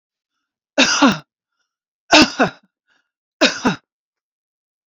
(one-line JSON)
{"three_cough_length": "4.9 s", "three_cough_amplitude": 31097, "three_cough_signal_mean_std_ratio": 0.33, "survey_phase": "beta (2021-08-13 to 2022-03-07)", "age": "45-64", "gender": "Female", "wearing_mask": "No", "symptom_none": true, "smoker_status": "Ex-smoker", "respiratory_condition_asthma": false, "respiratory_condition_other": false, "recruitment_source": "REACT", "submission_delay": "2 days", "covid_test_result": "Negative", "covid_test_method": "RT-qPCR"}